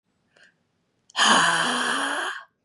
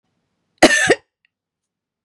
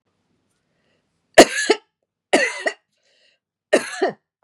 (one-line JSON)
{"exhalation_length": "2.6 s", "exhalation_amplitude": 21252, "exhalation_signal_mean_std_ratio": 0.56, "cough_length": "2.0 s", "cough_amplitude": 32768, "cough_signal_mean_std_ratio": 0.29, "three_cough_length": "4.4 s", "three_cough_amplitude": 32768, "three_cough_signal_mean_std_ratio": 0.27, "survey_phase": "beta (2021-08-13 to 2022-03-07)", "age": "45-64", "gender": "Female", "wearing_mask": "No", "symptom_none": true, "smoker_status": "Never smoked", "respiratory_condition_asthma": false, "respiratory_condition_other": false, "recruitment_source": "REACT", "submission_delay": "18 days", "covid_test_result": "Negative", "covid_test_method": "RT-qPCR", "influenza_a_test_result": "Negative", "influenza_b_test_result": "Negative"}